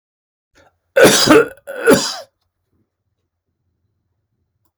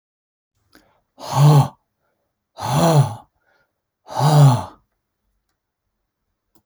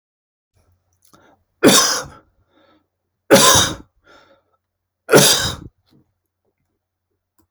{"cough_length": "4.8 s", "cough_amplitude": 32768, "cough_signal_mean_std_ratio": 0.33, "exhalation_length": "6.7 s", "exhalation_amplitude": 24590, "exhalation_signal_mean_std_ratio": 0.37, "three_cough_length": "7.5 s", "three_cough_amplitude": 32768, "three_cough_signal_mean_std_ratio": 0.31, "survey_phase": "alpha (2021-03-01 to 2021-08-12)", "age": "65+", "gender": "Male", "wearing_mask": "No", "symptom_none": true, "smoker_status": "Ex-smoker", "respiratory_condition_asthma": false, "respiratory_condition_other": false, "recruitment_source": "REACT", "submission_delay": "3 days", "covid_test_result": "Negative", "covid_test_method": "RT-qPCR"}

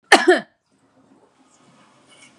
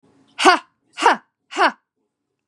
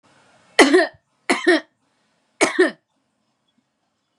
{"cough_length": "2.4 s", "cough_amplitude": 32768, "cough_signal_mean_std_ratio": 0.24, "exhalation_length": "2.5 s", "exhalation_amplitude": 32767, "exhalation_signal_mean_std_ratio": 0.34, "three_cough_length": "4.2 s", "three_cough_amplitude": 32768, "three_cough_signal_mean_std_ratio": 0.33, "survey_phase": "beta (2021-08-13 to 2022-03-07)", "age": "45-64", "gender": "Female", "wearing_mask": "No", "symptom_none": true, "smoker_status": "Never smoked", "respiratory_condition_asthma": true, "respiratory_condition_other": false, "recruitment_source": "REACT", "submission_delay": "3 days", "covid_test_result": "Negative", "covid_test_method": "RT-qPCR", "influenza_a_test_result": "Unknown/Void", "influenza_b_test_result": "Unknown/Void"}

